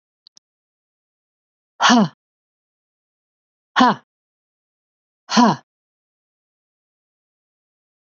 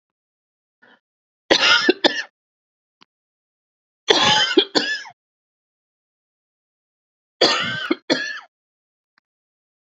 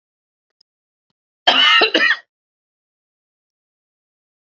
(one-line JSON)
{"exhalation_length": "8.1 s", "exhalation_amplitude": 27819, "exhalation_signal_mean_std_ratio": 0.23, "three_cough_length": "10.0 s", "three_cough_amplitude": 29166, "three_cough_signal_mean_std_ratio": 0.33, "cough_length": "4.4 s", "cough_amplitude": 31167, "cough_signal_mean_std_ratio": 0.31, "survey_phase": "beta (2021-08-13 to 2022-03-07)", "age": "45-64", "gender": "Female", "wearing_mask": "No", "symptom_none": true, "smoker_status": "Never smoked", "respiratory_condition_asthma": true, "respiratory_condition_other": false, "recruitment_source": "REACT", "submission_delay": "1 day", "covid_test_result": "Negative", "covid_test_method": "RT-qPCR", "influenza_a_test_result": "Negative", "influenza_b_test_result": "Negative"}